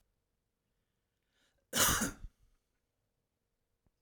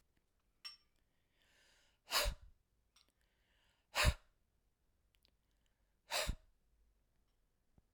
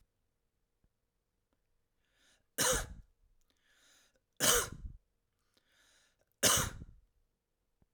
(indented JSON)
{
  "cough_length": "4.0 s",
  "cough_amplitude": 5899,
  "cough_signal_mean_std_ratio": 0.25,
  "exhalation_length": "7.9 s",
  "exhalation_amplitude": 3279,
  "exhalation_signal_mean_std_ratio": 0.24,
  "three_cough_length": "7.9 s",
  "three_cough_amplitude": 7473,
  "three_cough_signal_mean_std_ratio": 0.27,
  "survey_phase": "alpha (2021-03-01 to 2021-08-12)",
  "age": "45-64",
  "gender": "Male",
  "wearing_mask": "No",
  "symptom_none": true,
  "smoker_status": "Never smoked",
  "respiratory_condition_asthma": false,
  "respiratory_condition_other": false,
  "recruitment_source": "REACT",
  "submission_delay": "2 days",
  "covid_test_result": "Negative",
  "covid_test_method": "RT-qPCR"
}